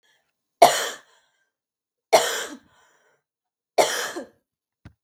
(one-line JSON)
{"three_cough_length": "5.0 s", "three_cough_amplitude": 32768, "three_cough_signal_mean_std_ratio": 0.28, "survey_phase": "beta (2021-08-13 to 2022-03-07)", "age": "18-44", "gender": "Female", "wearing_mask": "No", "symptom_none": true, "smoker_status": "Never smoked", "respiratory_condition_asthma": false, "respiratory_condition_other": false, "recruitment_source": "REACT", "submission_delay": "1 day", "covid_test_result": "Negative", "covid_test_method": "RT-qPCR", "influenza_a_test_result": "Negative", "influenza_b_test_result": "Negative"}